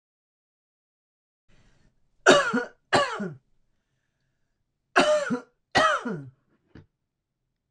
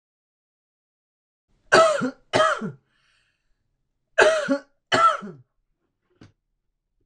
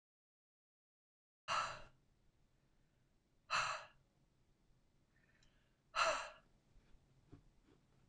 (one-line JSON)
{"three_cough_length": "7.7 s", "three_cough_amplitude": 25597, "three_cough_signal_mean_std_ratio": 0.33, "cough_length": "7.1 s", "cough_amplitude": 25612, "cough_signal_mean_std_ratio": 0.34, "exhalation_length": "8.1 s", "exhalation_amplitude": 2444, "exhalation_signal_mean_std_ratio": 0.29, "survey_phase": "beta (2021-08-13 to 2022-03-07)", "age": "65+", "gender": "Female", "wearing_mask": "No", "symptom_cough_any": true, "symptom_runny_or_blocked_nose": true, "symptom_sore_throat": true, "symptom_onset": "3 days", "smoker_status": "Ex-smoker", "respiratory_condition_asthma": false, "respiratory_condition_other": false, "recruitment_source": "Test and Trace", "submission_delay": "1 day", "covid_test_result": "Negative", "covid_test_method": "RT-qPCR"}